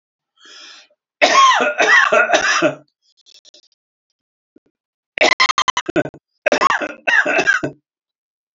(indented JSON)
{
  "cough_length": "8.5 s",
  "cough_amplitude": 29133,
  "cough_signal_mean_std_ratio": 0.47,
  "survey_phase": "alpha (2021-03-01 to 2021-08-12)",
  "age": "65+",
  "gender": "Male",
  "wearing_mask": "No",
  "symptom_none": true,
  "smoker_status": "Never smoked",
  "respiratory_condition_asthma": false,
  "respiratory_condition_other": false,
  "recruitment_source": "REACT",
  "submission_delay": "1 day",
  "covid_test_result": "Negative",
  "covid_test_method": "RT-qPCR"
}